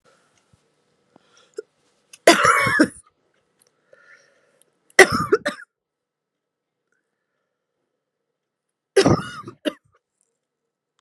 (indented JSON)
{
  "three_cough_length": "11.0 s",
  "three_cough_amplitude": 32768,
  "three_cough_signal_mean_std_ratio": 0.24,
  "survey_phase": "beta (2021-08-13 to 2022-03-07)",
  "age": "18-44",
  "gender": "Female",
  "wearing_mask": "No",
  "symptom_cough_any": true,
  "symptom_runny_or_blocked_nose": true,
  "symptom_onset": "7 days",
  "smoker_status": "Ex-smoker",
  "respiratory_condition_asthma": false,
  "respiratory_condition_other": false,
  "recruitment_source": "REACT",
  "submission_delay": "1 day",
  "covid_test_result": "Negative",
  "covid_test_method": "RT-qPCR",
  "influenza_a_test_result": "Negative",
  "influenza_b_test_result": "Negative"
}